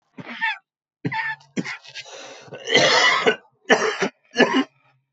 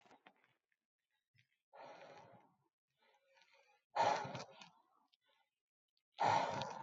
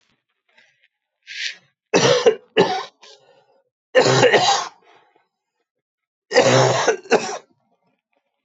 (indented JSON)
{
  "cough_length": "5.1 s",
  "cough_amplitude": 25473,
  "cough_signal_mean_std_ratio": 0.5,
  "exhalation_length": "6.8 s",
  "exhalation_amplitude": 2621,
  "exhalation_signal_mean_std_ratio": 0.31,
  "three_cough_length": "8.4 s",
  "three_cough_amplitude": 26881,
  "three_cough_signal_mean_std_ratio": 0.42,
  "survey_phase": "beta (2021-08-13 to 2022-03-07)",
  "age": "45-64",
  "gender": "Male",
  "wearing_mask": "No",
  "symptom_cough_any": true,
  "symptom_sore_throat": true,
  "symptom_fatigue": true,
  "symptom_onset": "2 days",
  "smoker_status": "Never smoked",
  "respiratory_condition_asthma": false,
  "respiratory_condition_other": false,
  "recruitment_source": "Test and Trace",
  "submission_delay": "1 day",
  "covid_test_result": "Positive",
  "covid_test_method": "RT-qPCR",
  "covid_ct_value": 24.0,
  "covid_ct_gene": "N gene"
}